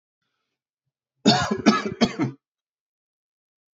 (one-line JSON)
{"three_cough_length": "3.8 s", "three_cough_amplitude": 24469, "three_cough_signal_mean_std_ratio": 0.33, "survey_phase": "beta (2021-08-13 to 2022-03-07)", "age": "18-44", "gender": "Male", "wearing_mask": "No", "symptom_cough_any": true, "symptom_runny_or_blocked_nose": true, "symptom_sore_throat": true, "symptom_abdominal_pain": true, "symptom_headache": true, "symptom_onset": "12 days", "smoker_status": "Never smoked", "respiratory_condition_asthma": false, "respiratory_condition_other": false, "recruitment_source": "REACT", "submission_delay": "1 day", "covid_test_result": "Positive", "covid_test_method": "RT-qPCR", "covid_ct_value": 25.0, "covid_ct_gene": "E gene", "influenza_a_test_result": "Negative", "influenza_b_test_result": "Negative"}